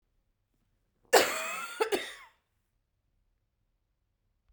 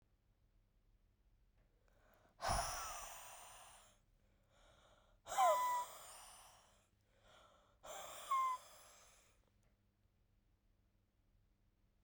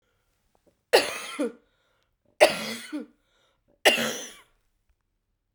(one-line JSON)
{"cough_length": "4.5 s", "cough_amplitude": 13341, "cough_signal_mean_std_ratio": 0.27, "exhalation_length": "12.0 s", "exhalation_amplitude": 2032, "exhalation_signal_mean_std_ratio": 0.34, "three_cough_length": "5.5 s", "three_cough_amplitude": 29366, "three_cough_signal_mean_std_ratio": 0.29, "survey_phase": "beta (2021-08-13 to 2022-03-07)", "age": "18-44", "gender": "Female", "wearing_mask": "No", "symptom_runny_or_blocked_nose": true, "symptom_shortness_of_breath": true, "symptom_sore_throat": true, "symptom_diarrhoea": true, "symptom_fatigue": true, "symptom_fever_high_temperature": true, "symptom_headache": true, "symptom_change_to_sense_of_smell_or_taste": true, "symptom_loss_of_taste": true, "symptom_other": true, "symptom_onset": "3 days", "smoker_status": "Never smoked", "respiratory_condition_asthma": false, "respiratory_condition_other": false, "recruitment_source": "Test and Trace", "submission_delay": "2 days", "covid_test_result": "Positive", "covid_test_method": "RT-qPCR", "covid_ct_value": 15.3, "covid_ct_gene": "ORF1ab gene", "covid_ct_mean": 15.5, "covid_viral_load": "8100000 copies/ml", "covid_viral_load_category": "High viral load (>1M copies/ml)"}